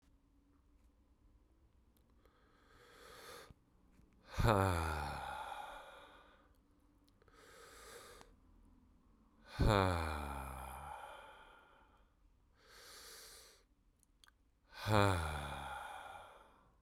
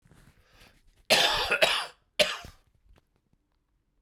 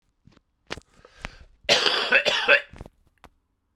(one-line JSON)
{"exhalation_length": "16.8 s", "exhalation_amplitude": 4768, "exhalation_signal_mean_std_ratio": 0.37, "three_cough_length": "4.0 s", "three_cough_amplitude": 20905, "three_cough_signal_mean_std_ratio": 0.36, "cough_length": "3.8 s", "cough_amplitude": 26514, "cough_signal_mean_std_ratio": 0.38, "survey_phase": "beta (2021-08-13 to 2022-03-07)", "age": "45-64", "gender": "Male", "wearing_mask": "No", "symptom_cough_any": true, "symptom_runny_or_blocked_nose": true, "symptom_abdominal_pain": true, "symptom_fatigue": true, "symptom_headache": true, "symptom_onset": "4 days", "smoker_status": "Never smoked", "respiratory_condition_asthma": false, "respiratory_condition_other": false, "recruitment_source": "Test and Trace", "submission_delay": "2 days", "covid_test_result": "Positive", "covid_test_method": "RT-qPCR", "covid_ct_value": 19.9, "covid_ct_gene": "N gene"}